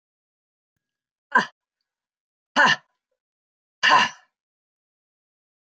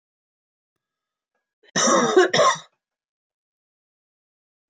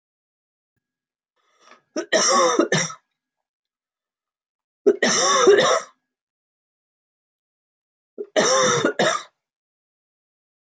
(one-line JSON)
{"exhalation_length": "5.6 s", "exhalation_amplitude": 22327, "exhalation_signal_mean_std_ratio": 0.25, "cough_length": "4.7 s", "cough_amplitude": 19163, "cough_signal_mean_std_ratio": 0.32, "three_cough_length": "10.8 s", "three_cough_amplitude": 20411, "three_cough_signal_mean_std_ratio": 0.39, "survey_phase": "beta (2021-08-13 to 2022-03-07)", "age": "65+", "gender": "Female", "wearing_mask": "No", "symptom_cough_any": true, "smoker_status": "Never smoked", "respiratory_condition_asthma": false, "respiratory_condition_other": false, "recruitment_source": "REACT", "submission_delay": "1 day", "covid_test_result": "Negative", "covid_test_method": "RT-qPCR", "influenza_a_test_result": "Negative", "influenza_b_test_result": "Negative"}